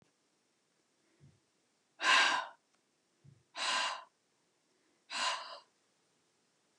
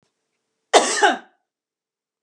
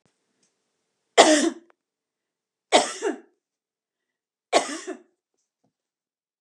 {"exhalation_length": "6.8 s", "exhalation_amplitude": 6217, "exhalation_signal_mean_std_ratio": 0.32, "cough_length": "2.2 s", "cough_amplitude": 32649, "cough_signal_mean_std_ratio": 0.31, "three_cough_length": "6.4 s", "three_cough_amplitude": 32767, "three_cough_signal_mean_std_ratio": 0.26, "survey_phase": "beta (2021-08-13 to 2022-03-07)", "age": "45-64", "gender": "Female", "wearing_mask": "No", "symptom_none": true, "smoker_status": "Ex-smoker", "respiratory_condition_asthma": false, "respiratory_condition_other": false, "recruitment_source": "REACT", "submission_delay": "3 days", "covid_test_result": "Negative", "covid_test_method": "RT-qPCR", "influenza_a_test_result": "Negative", "influenza_b_test_result": "Negative"}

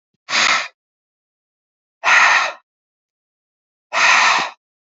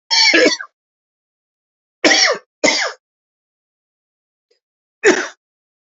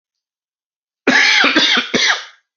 {"exhalation_length": "4.9 s", "exhalation_amplitude": 30009, "exhalation_signal_mean_std_ratio": 0.43, "three_cough_length": "5.8 s", "three_cough_amplitude": 32456, "three_cough_signal_mean_std_ratio": 0.37, "cough_length": "2.6 s", "cough_amplitude": 30008, "cough_signal_mean_std_ratio": 0.57, "survey_phase": "alpha (2021-03-01 to 2021-08-12)", "age": "45-64", "gender": "Male", "wearing_mask": "No", "symptom_cough_any": true, "symptom_headache": true, "symptom_change_to_sense_of_smell_or_taste": true, "symptom_loss_of_taste": true, "smoker_status": "Never smoked", "respiratory_condition_asthma": false, "respiratory_condition_other": false, "recruitment_source": "Test and Trace", "submission_delay": "2 days", "covid_test_result": "Positive", "covid_test_method": "RT-qPCR", "covid_ct_value": 12.4, "covid_ct_gene": "ORF1ab gene", "covid_ct_mean": 12.6, "covid_viral_load": "71000000 copies/ml", "covid_viral_load_category": "High viral load (>1M copies/ml)"}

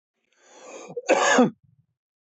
{"cough_length": "2.3 s", "cough_amplitude": 18049, "cough_signal_mean_std_ratio": 0.38, "survey_phase": "beta (2021-08-13 to 2022-03-07)", "age": "18-44", "gender": "Male", "wearing_mask": "No", "symptom_none": true, "smoker_status": "Never smoked", "respiratory_condition_asthma": true, "respiratory_condition_other": false, "recruitment_source": "REACT", "submission_delay": "1 day", "covid_test_result": "Negative", "covid_test_method": "RT-qPCR", "influenza_a_test_result": "Negative", "influenza_b_test_result": "Negative"}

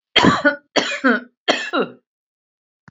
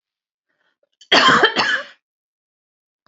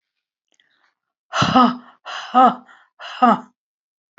{"three_cough_length": "2.9 s", "three_cough_amplitude": 29324, "three_cough_signal_mean_std_ratio": 0.46, "cough_length": "3.1 s", "cough_amplitude": 28945, "cough_signal_mean_std_ratio": 0.37, "exhalation_length": "4.2 s", "exhalation_amplitude": 30379, "exhalation_signal_mean_std_ratio": 0.35, "survey_phase": "beta (2021-08-13 to 2022-03-07)", "age": "65+", "gender": "Female", "wearing_mask": "No", "symptom_none": true, "smoker_status": "Ex-smoker", "respiratory_condition_asthma": false, "respiratory_condition_other": false, "recruitment_source": "REACT", "submission_delay": "1 day", "covid_test_result": "Negative", "covid_test_method": "RT-qPCR", "influenza_a_test_result": "Negative", "influenza_b_test_result": "Negative"}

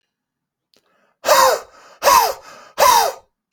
{"exhalation_length": "3.5 s", "exhalation_amplitude": 31807, "exhalation_signal_mean_std_ratio": 0.44, "survey_phase": "beta (2021-08-13 to 2022-03-07)", "age": "18-44", "gender": "Male", "wearing_mask": "No", "symptom_sore_throat": true, "symptom_onset": "2 days", "smoker_status": "Never smoked", "respiratory_condition_asthma": false, "respiratory_condition_other": false, "recruitment_source": "REACT", "submission_delay": "0 days", "covid_test_result": "Negative", "covid_test_method": "RT-qPCR"}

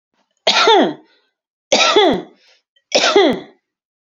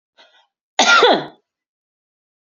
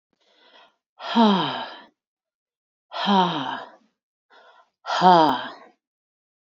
{"three_cough_length": "4.1 s", "three_cough_amplitude": 32767, "three_cough_signal_mean_std_ratio": 0.5, "cough_length": "2.5 s", "cough_amplitude": 31396, "cough_signal_mean_std_ratio": 0.34, "exhalation_length": "6.6 s", "exhalation_amplitude": 26213, "exhalation_signal_mean_std_ratio": 0.37, "survey_phase": "beta (2021-08-13 to 2022-03-07)", "age": "45-64", "gender": "Female", "wearing_mask": "No", "symptom_shortness_of_breath": true, "symptom_onset": "12 days", "smoker_status": "Never smoked", "respiratory_condition_asthma": false, "respiratory_condition_other": false, "recruitment_source": "REACT", "submission_delay": "1 day", "covid_test_result": "Negative", "covid_test_method": "RT-qPCR"}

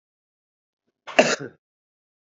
{"cough_length": "2.3 s", "cough_amplitude": 27870, "cough_signal_mean_std_ratio": 0.21, "survey_phase": "beta (2021-08-13 to 2022-03-07)", "age": "45-64", "gender": "Male", "wearing_mask": "No", "symptom_cough_any": true, "symptom_sore_throat": true, "symptom_onset": "7 days", "smoker_status": "Never smoked", "respiratory_condition_asthma": false, "respiratory_condition_other": false, "recruitment_source": "Test and Trace", "submission_delay": "2 days", "covid_test_result": "Positive", "covid_test_method": "RT-qPCR", "covid_ct_value": 18.0, "covid_ct_gene": "ORF1ab gene", "covid_ct_mean": 18.3, "covid_viral_load": "1000000 copies/ml", "covid_viral_load_category": "High viral load (>1M copies/ml)"}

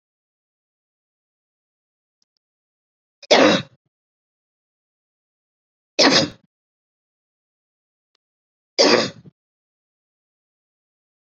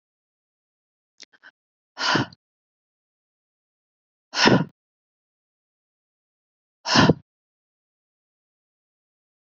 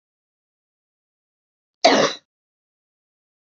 {"three_cough_length": "11.3 s", "three_cough_amplitude": 30224, "three_cough_signal_mean_std_ratio": 0.22, "exhalation_length": "9.5 s", "exhalation_amplitude": 26718, "exhalation_signal_mean_std_ratio": 0.21, "cough_length": "3.6 s", "cough_amplitude": 28900, "cough_signal_mean_std_ratio": 0.21, "survey_phase": "beta (2021-08-13 to 2022-03-07)", "age": "45-64", "gender": "Female", "wearing_mask": "No", "symptom_none": true, "smoker_status": "Never smoked", "respiratory_condition_asthma": false, "respiratory_condition_other": false, "recruitment_source": "REACT", "submission_delay": "1 day", "covid_test_result": "Negative", "covid_test_method": "RT-qPCR", "influenza_a_test_result": "Unknown/Void", "influenza_b_test_result": "Unknown/Void"}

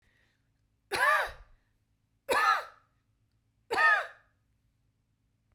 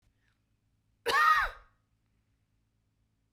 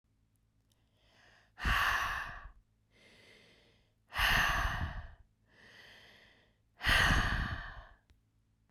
{"three_cough_length": "5.5 s", "three_cough_amplitude": 7027, "three_cough_signal_mean_std_ratio": 0.36, "cough_length": "3.3 s", "cough_amplitude": 6617, "cough_signal_mean_std_ratio": 0.3, "exhalation_length": "8.7 s", "exhalation_amplitude": 5481, "exhalation_signal_mean_std_ratio": 0.44, "survey_phase": "beta (2021-08-13 to 2022-03-07)", "age": "45-64", "gender": "Female", "wearing_mask": "No", "symptom_none": true, "smoker_status": "Never smoked", "respiratory_condition_asthma": false, "respiratory_condition_other": false, "recruitment_source": "REACT", "submission_delay": "2 days", "covid_test_result": "Negative", "covid_test_method": "RT-qPCR"}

